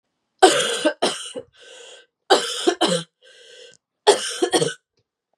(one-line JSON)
{"three_cough_length": "5.4 s", "three_cough_amplitude": 32767, "three_cough_signal_mean_std_ratio": 0.42, "survey_phase": "beta (2021-08-13 to 2022-03-07)", "age": "18-44", "gender": "Female", "wearing_mask": "No", "symptom_cough_any": true, "symptom_runny_or_blocked_nose": true, "symptom_shortness_of_breath": true, "symptom_fatigue": true, "symptom_fever_high_temperature": true, "symptom_headache": true, "symptom_change_to_sense_of_smell_or_taste": true, "symptom_loss_of_taste": true, "symptom_other": true, "symptom_onset": "4 days", "smoker_status": "Never smoked", "respiratory_condition_asthma": true, "respiratory_condition_other": true, "recruitment_source": "Test and Trace", "submission_delay": "2 days", "covid_test_result": "Positive", "covid_test_method": "LAMP"}